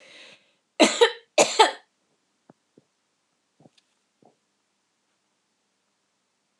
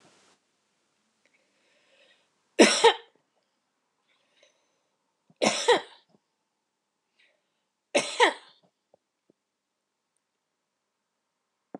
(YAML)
cough_length: 6.6 s
cough_amplitude: 25421
cough_signal_mean_std_ratio: 0.21
three_cough_length: 11.8 s
three_cough_amplitude: 24364
three_cough_signal_mean_std_ratio: 0.2
survey_phase: beta (2021-08-13 to 2022-03-07)
age: 65+
gender: Female
wearing_mask: 'No'
symptom_none: true
smoker_status: Ex-smoker
respiratory_condition_asthma: false
respiratory_condition_other: false
recruitment_source: REACT
submission_delay: 3 days
covid_test_result: Negative
covid_test_method: RT-qPCR